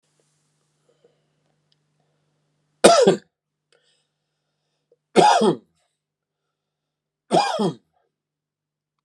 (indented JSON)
{
  "three_cough_length": "9.0 s",
  "three_cough_amplitude": 32768,
  "three_cough_signal_mean_std_ratio": 0.26,
  "survey_phase": "beta (2021-08-13 to 2022-03-07)",
  "age": "18-44",
  "gender": "Male",
  "wearing_mask": "No",
  "symptom_runny_or_blocked_nose": true,
  "symptom_onset": "3 days",
  "smoker_status": "Never smoked",
  "respiratory_condition_asthma": false,
  "respiratory_condition_other": false,
  "recruitment_source": "Test and Trace",
  "submission_delay": "1 day",
  "covid_test_result": "Positive",
  "covid_test_method": "RT-qPCR"
}